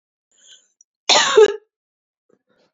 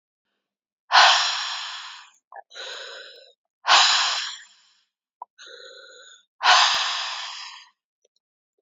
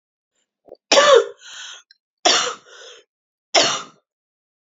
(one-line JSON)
{"cough_length": "2.7 s", "cough_amplitude": 29774, "cough_signal_mean_std_ratio": 0.3, "exhalation_length": "8.6 s", "exhalation_amplitude": 26523, "exhalation_signal_mean_std_ratio": 0.4, "three_cough_length": "4.8 s", "three_cough_amplitude": 32726, "three_cough_signal_mean_std_ratio": 0.34, "survey_phase": "beta (2021-08-13 to 2022-03-07)", "age": "45-64", "gender": "Female", "wearing_mask": "No", "symptom_runny_or_blocked_nose": true, "smoker_status": "Never smoked", "respiratory_condition_asthma": false, "respiratory_condition_other": false, "recruitment_source": "REACT", "submission_delay": "2 days", "covid_test_result": "Negative", "covid_test_method": "RT-qPCR", "influenza_a_test_result": "Unknown/Void", "influenza_b_test_result": "Unknown/Void"}